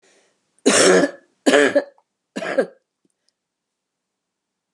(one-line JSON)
{"three_cough_length": "4.7 s", "three_cough_amplitude": 28945, "three_cough_signal_mean_std_ratio": 0.36, "survey_phase": "beta (2021-08-13 to 2022-03-07)", "age": "65+", "gender": "Female", "wearing_mask": "No", "symptom_cough_any": true, "smoker_status": "Never smoked", "respiratory_condition_asthma": false, "respiratory_condition_other": false, "recruitment_source": "REACT", "submission_delay": "1 day", "covid_test_result": "Negative", "covid_test_method": "RT-qPCR", "influenza_a_test_result": "Negative", "influenza_b_test_result": "Negative"}